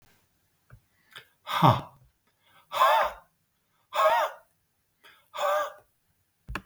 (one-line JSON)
{"exhalation_length": "6.7 s", "exhalation_amplitude": 17417, "exhalation_signal_mean_std_ratio": 0.36, "survey_phase": "beta (2021-08-13 to 2022-03-07)", "age": "45-64", "gender": "Male", "wearing_mask": "No", "symptom_none": true, "symptom_onset": "9 days", "smoker_status": "Never smoked", "respiratory_condition_asthma": false, "respiratory_condition_other": false, "recruitment_source": "REACT", "submission_delay": "3 days", "covid_test_result": "Negative", "covid_test_method": "RT-qPCR", "influenza_a_test_result": "Negative", "influenza_b_test_result": "Negative"}